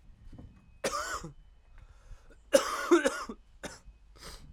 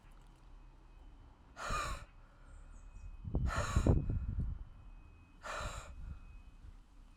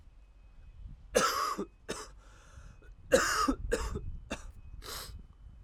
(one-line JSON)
{"cough_length": "4.5 s", "cough_amplitude": 13576, "cough_signal_mean_std_ratio": 0.37, "exhalation_length": "7.2 s", "exhalation_amplitude": 5609, "exhalation_signal_mean_std_ratio": 0.54, "three_cough_length": "5.6 s", "three_cough_amplitude": 11311, "three_cough_signal_mean_std_ratio": 0.52, "survey_phase": "alpha (2021-03-01 to 2021-08-12)", "age": "18-44", "gender": "Male", "wearing_mask": "No", "symptom_cough_any": true, "symptom_new_continuous_cough": true, "symptom_shortness_of_breath": true, "symptom_abdominal_pain": true, "symptom_diarrhoea": true, "symptom_fatigue": true, "symptom_fever_high_temperature": true, "symptom_headache": true, "symptom_change_to_sense_of_smell_or_taste": true, "symptom_loss_of_taste": true, "symptom_onset": "2 days", "smoker_status": "Never smoked", "respiratory_condition_asthma": false, "respiratory_condition_other": false, "recruitment_source": "Test and Trace", "submission_delay": "1 day", "covid_test_result": "Positive", "covid_test_method": "RT-qPCR"}